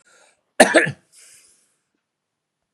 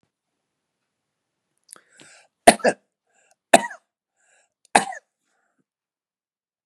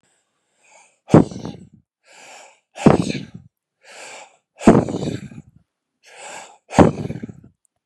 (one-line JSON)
{"cough_length": "2.7 s", "cough_amplitude": 32768, "cough_signal_mean_std_ratio": 0.23, "three_cough_length": "6.7 s", "three_cough_amplitude": 32768, "three_cough_signal_mean_std_ratio": 0.15, "exhalation_length": "7.9 s", "exhalation_amplitude": 32768, "exhalation_signal_mean_std_ratio": 0.28, "survey_phase": "beta (2021-08-13 to 2022-03-07)", "age": "65+", "gender": "Male", "wearing_mask": "No", "symptom_none": true, "smoker_status": "Ex-smoker", "respiratory_condition_asthma": false, "respiratory_condition_other": false, "recruitment_source": "REACT", "submission_delay": "4 days", "covid_test_result": "Negative", "covid_test_method": "RT-qPCR", "influenza_a_test_result": "Negative", "influenza_b_test_result": "Negative"}